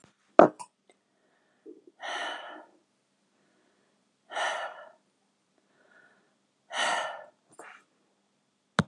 exhalation_length: 8.9 s
exhalation_amplitude: 32764
exhalation_signal_mean_std_ratio: 0.21
survey_phase: beta (2021-08-13 to 2022-03-07)
age: 65+
gender: Female
wearing_mask: 'No'
symptom_none: true
smoker_status: Never smoked
respiratory_condition_asthma: false
respiratory_condition_other: false
recruitment_source: REACT
submission_delay: 1 day
covid_test_result: Negative
covid_test_method: RT-qPCR
influenza_a_test_result: Negative
influenza_b_test_result: Negative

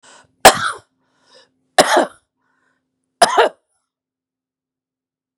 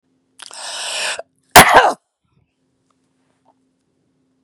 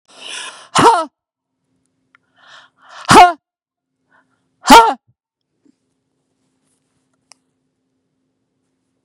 three_cough_length: 5.4 s
three_cough_amplitude: 32768
three_cough_signal_mean_std_ratio: 0.26
cough_length: 4.4 s
cough_amplitude: 32768
cough_signal_mean_std_ratio: 0.27
exhalation_length: 9.0 s
exhalation_amplitude: 32768
exhalation_signal_mean_std_ratio: 0.24
survey_phase: beta (2021-08-13 to 2022-03-07)
age: 45-64
gender: Female
wearing_mask: 'No'
symptom_none: true
symptom_onset: 12 days
smoker_status: Ex-smoker
respiratory_condition_asthma: false
respiratory_condition_other: false
recruitment_source: REACT
submission_delay: 1 day
covid_test_result: Negative
covid_test_method: RT-qPCR
influenza_a_test_result: Unknown/Void
influenza_b_test_result: Unknown/Void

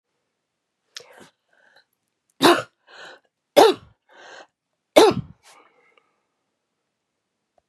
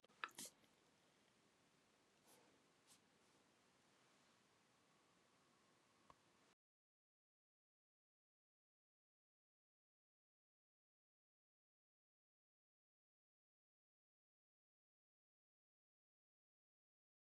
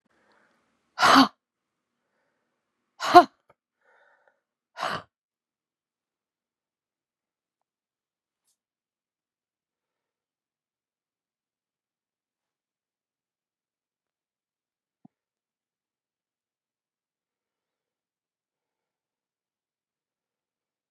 three_cough_length: 7.7 s
three_cough_amplitude: 32768
three_cough_signal_mean_std_ratio: 0.22
cough_length: 17.3 s
cough_amplitude: 1219
cough_signal_mean_std_ratio: 0.2
exhalation_length: 20.9 s
exhalation_amplitude: 32707
exhalation_signal_mean_std_ratio: 0.11
survey_phase: beta (2021-08-13 to 2022-03-07)
age: 65+
gender: Female
wearing_mask: 'No'
symptom_none: true
smoker_status: Ex-smoker
respiratory_condition_asthma: false
respiratory_condition_other: true
recruitment_source: REACT
submission_delay: 2 days
covid_test_result: Negative
covid_test_method: RT-qPCR
influenza_a_test_result: Negative
influenza_b_test_result: Negative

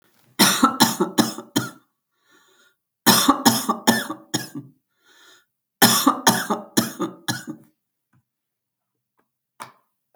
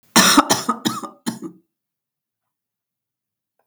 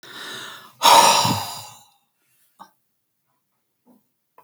three_cough_length: 10.2 s
three_cough_amplitude: 32768
three_cough_signal_mean_std_ratio: 0.38
cough_length: 3.7 s
cough_amplitude: 32768
cough_signal_mean_std_ratio: 0.32
exhalation_length: 4.4 s
exhalation_amplitude: 31335
exhalation_signal_mean_std_ratio: 0.32
survey_phase: alpha (2021-03-01 to 2021-08-12)
age: 45-64
gender: Female
wearing_mask: 'No'
symptom_none: true
smoker_status: Never smoked
respiratory_condition_asthma: false
respiratory_condition_other: false
recruitment_source: REACT
submission_delay: 3 days
covid_test_result: Negative
covid_test_method: RT-qPCR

